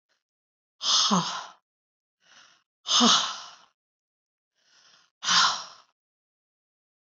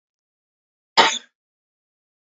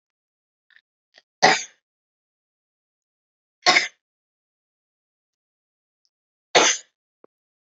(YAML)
exhalation_length: 7.1 s
exhalation_amplitude: 14399
exhalation_signal_mean_std_ratio: 0.35
cough_length: 2.4 s
cough_amplitude: 29718
cough_signal_mean_std_ratio: 0.2
three_cough_length: 7.8 s
three_cough_amplitude: 30426
three_cough_signal_mean_std_ratio: 0.2
survey_phase: beta (2021-08-13 to 2022-03-07)
age: 18-44
gender: Female
wearing_mask: 'No'
symptom_runny_or_blocked_nose: true
symptom_fatigue: true
symptom_headache: true
symptom_change_to_sense_of_smell_or_taste: true
symptom_loss_of_taste: true
symptom_onset: 4 days
smoker_status: Never smoked
respiratory_condition_asthma: false
respiratory_condition_other: false
recruitment_source: Test and Trace
submission_delay: 1 day
covid_test_result: Positive
covid_test_method: ePCR